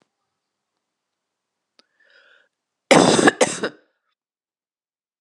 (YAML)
cough_length: 5.2 s
cough_amplitude: 32674
cough_signal_mean_std_ratio: 0.24
survey_phase: beta (2021-08-13 to 2022-03-07)
age: 45-64
gender: Female
wearing_mask: 'No'
symptom_cough_any: true
symptom_runny_or_blocked_nose: true
symptom_sore_throat: true
symptom_fatigue: true
symptom_onset: 6 days
smoker_status: Never smoked
respiratory_condition_asthma: false
respiratory_condition_other: false
recruitment_source: Test and Trace
submission_delay: 2 days
covid_test_result: Positive
covid_test_method: RT-qPCR
covid_ct_value: 15.9
covid_ct_gene: ORF1ab gene
covid_ct_mean: 16.2
covid_viral_load: 4800000 copies/ml
covid_viral_load_category: High viral load (>1M copies/ml)